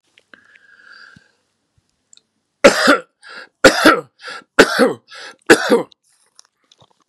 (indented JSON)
{
  "three_cough_length": "7.1 s",
  "three_cough_amplitude": 32768,
  "three_cough_signal_mean_std_ratio": 0.32,
  "survey_phase": "beta (2021-08-13 to 2022-03-07)",
  "age": "65+",
  "gender": "Male",
  "wearing_mask": "No",
  "symptom_cough_any": true,
  "symptom_runny_or_blocked_nose": true,
  "smoker_status": "Never smoked",
  "respiratory_condition_asthma": false,
  "respiratory_condition_other": false,
  "recruitment_source": "REACT",
  "submission_delay": "3 days",
  "covid_test_result": "Negative",
  "covid_test_method": "RT-qPCR",
  "influenza_a_test_result": "Negative",
  "influenza_b_test_result": "Negative"
}